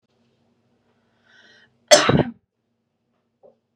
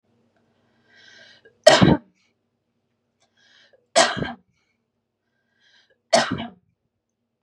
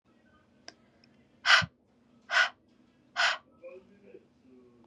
cough_length: 3.8 s
cough_amplitude: 32768
cough_signal_mean_std_ratio: 0.22
three_cough_length: 7.4 s
three_cough_amplitude: 32768
three_cough_signal_mean_std_ratio: 0.24
exhalation_length: 4.9 s
exhalation_amplitude: 13285
exhalation_signal_mean_std_ratio: 0.28
survey_phase: beta (2021-08-13 to 2022-03-07)
age: 18-44
gender: Female
wearing_mask: 'No'
symptom_none: true
smoker_status: Ex-smoker
respiratory_condition_asthma: false
respiratory_condition_other: false
recruitment_source: REACT
submission_delay: 1 day
covid_test_result: Negative
covid_test_method: RT-qPCR
influenza_a_test_result: Negative
influenza_b_test_result: Negative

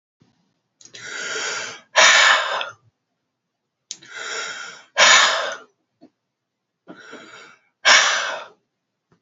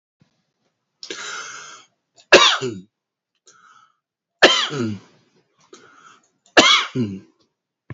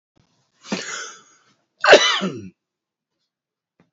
exhalation_length: 9.2 s
exhalation_amplitude: 31566
exhalation_signal_mean_std_ratio: 0.39
three_cough_length: 7.9 s
three_cough_amplitude: 31788
three_cough_signal_mean_std_ratio: 0.31
cough_length: 3.9 s
cough_amplitude: 30295
cough_signal_mean_std_ratio: 0.28
survey_phase: alpha (2021-03-01 to 2021-08-12)
age: 65+
gender: Male
wearing_mask: 'No'
symptom_none: true
smoker_status: Never smoked
respiratory_condition_asthma: false
respiratory_condition_other: false
recruitment_source: REACT
submission_delay: 1 day
covid_test_result: Negative
covid_test_method: RT-qPCR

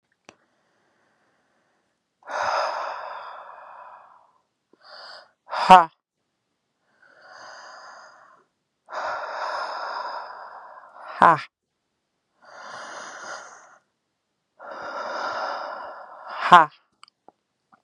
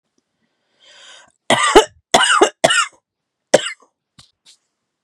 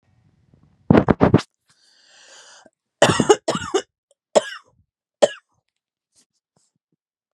exhalation_length: 17.8 s
exhalation_amplitude: 32768
exhalation_signal_mean_std_ratio: 0.26
cough_length: 5.0 s
cough_amplitude: 32768
cough_signal_mean_std_ratio: 0.33
three_cough_length: 7.3 s
three_cough_amplitude: 32768
three_cough_signal_mean_std_ratio: 0.26
survey_phase: beta (2021-08-13 to 2022-03-07)
age: 18-44
gender: Female
wearing_mask: 'No'
symptom_sore_throat: true
symptom_fatigue: true
symptom_change_to_sense_of_smell_or_taste: true
symptom_other: true
smoker_status: Ex-smoker
respiratory_condition_asthma: false
respiratory_condition_other: false
recruitment_source: Test and Trace
submission_delay: 2 days
covid_test_result: Positive
covid_test_method: LFT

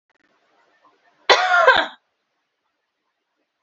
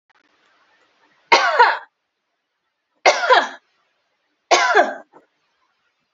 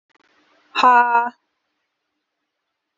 cough_length: 3.6 s
cough_amplitude: 32768
cough_signal_mean_std_ratio: 0.3
three_cough_length: 6.1 s
three_cough_amplitude: 30551
three_cough_signal_mean_std_ratio: 0.35
exhalation_length: 3.0 s
exhalation_amplitude: 29615
exhalation_signal_mean_std_ratio: 0.32
survey_phase: beta (2021-08-13 to 2022-03-07)
age: 18-44
gender: Female
wearing_mask: 'No'
symptom_none: true
smoker_status: Current smoker (e-cigarettes or vapes only)
respiratory_condition_asthma: false
respiratory_condition_other: false
recruitment_source: Test and Trace
submission_delay: 4 days
covid_test_result: Negative
covid_test_method: RT-qPCR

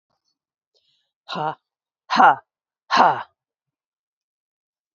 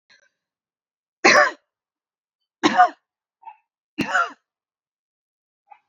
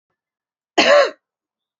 exhalation_length: 4.9 s
exhalation_amplitude: 27202
exhalation_signal_mean_std_ratio: 0.26
three_cough_length: 5.9 s
three_cough_amplitude: 28791
three_cough_signal_mean_std_ratio: 0.27
cough_length: 1.8 s
cough_amplitude: 29316
cough_signal_mean_std_ratio: 0.34
survey_phase: beta (2021-08-13 to 2022-03-07)
age: 45-64
gender: Female
wearing_mask: 'No'
symptom_none: true
smoker_status: Never smoked
respiratory_condition_asthma: true
respiratory_condition_other: false
recruitment_source: REACT
submission_delay: 2 days
covid_test_result: Negative
covid_test_method: RT-qPCR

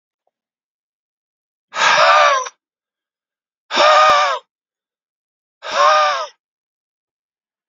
exhalation_length: 7.7 s
exhalation_amplitude: 31687
exhalation_signal_mean_std_ratio: 0.42
survey_phase: beta (2021-08-13 to 2022-03-07)
age: 18-44
gender: Male
wearing_mask: 'No'
symptom_cough_any: true
symptom_runny_or_blocked_nose: true
symptom_sore_throat: true
symptom_onset: 3 days
smoker_status: Never smoked
respiratory_condition_asthma: false
respiratory_condition_other: false
recruitment_source: Test and Trace
submission_delay: 1 day
covid_test_result: Positive
covid_test_method: RT-qPCR
covid_ct_value: 30.9
covid_ct_gene: N gene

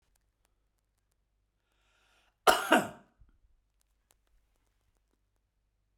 cough_length: 6.0 s
cough_amplitude: 14597
cough_signal_mean_std_ratio: 0.17
survey_phase: beta (2021-08-13 to 2022-03-07)
age: 45-64
gender: Male
wearing_mask: 'No'
symptom_none: true
smoker_status: Ex-smoker
respiratory_condition_asthma: false
respiratory_condition_other: false
recruitment_source: REACT
submission_delay: 2 days
covid_test_result: Negative
covid_test_method: RT-qPCR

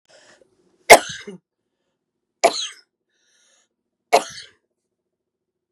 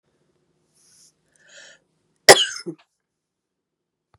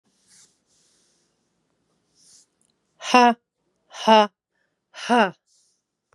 three_cough_length: 5.7 s
three_cough_amplitude: 32768
three_cough_signal_mean_std_ratio: 0.18
cough_length: 4.2 s
cough_amplitude: 32768
cough_signal_mean_std_ratio: 0.15
exhalation_length: 6.1 s
exhalation_amplitude: 31425
exhalation_signal_mean_std_ratio: 0.24
survey_phase: beta (2021-08-13 to 2022-03-07)
age: 45-64
gender: Female
wearing_mask: 'No'
symptom_runny_or_blocked_nose: true
symptom_headache: true
symptom_change_to_sense_of_smell_or_taste: true
symptom_loss_of_taste: true
smoker_status: Ex-smoker
respiratory_condition_asthma: false
respiratory_condition_other: false
recruitment_source: Test and Trace
submission_delay: 2 days
covid_test_result: Positive
covid_test_method: LFT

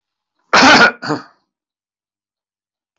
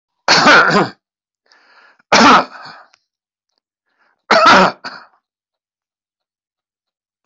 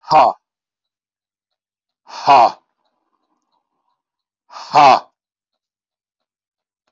cough_length: 3.0 s
cough_amplitude: 28212
cough_signal_mean_std_ratio: 0.35
three_cough_length: 7.3 s
three_cough_amplitude: 32768
three_cough_signal_mean_std_ratio: 0.38
exhalation_length: 6.9 s
exhalation_amplitude: 30559
exhalation_signal_mean_std_ratio: 0.27
survey_phase: alpha (2021-03-01 to 2021-08-12)
age: 65+
gender: Male
wearing_mask: 'No'
symptom_none: true
smoker_status: Ex-smoker
respiratory_condition_asthma: false
respiratory_condition_other: true
recruitment_source: REACT
submission_delay: 4 days
covid_test_result: Negative
covid_test_method: RT-qPCR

